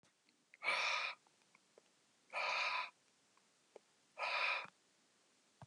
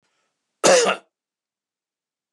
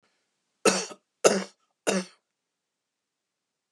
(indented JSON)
{
  "exhalation_length": "5.7 s",
  "exhalation_amplitude": 1872,
  "exhalation_signal_mean_std_ratio": 0.46,
  "cough_length": "2.3 s",
  "cough_amplitude": 26480,
  "cough_signal_mean_std_ratio": 0.29,
  "three_cough_length": "3.7 s",
  "three_cough_amplitude": 25985,
  "three_cough_signal_mean_std_ratio": 0.27,
  "survey_phase": "beta (2021-08-13 to 2022-03-07)",
  "age": "65+",
  "gender": "Male",
  "wearing_mask": "No",
  "symptom_none": true,
  "smoker_status": "Never smoked",
  "respiratory_condition_asthma": false,
  "respiratory_condition_other": false,
  "recruitment_source": "REACT",
  "submission_delay": "1 day",
  "covid_test_result": "Negative",
  "covid_test_method": "RT-qPCR",
  "influenza_a_test_result": "Negative",
  "influenza_b_test_result": "Negative"
}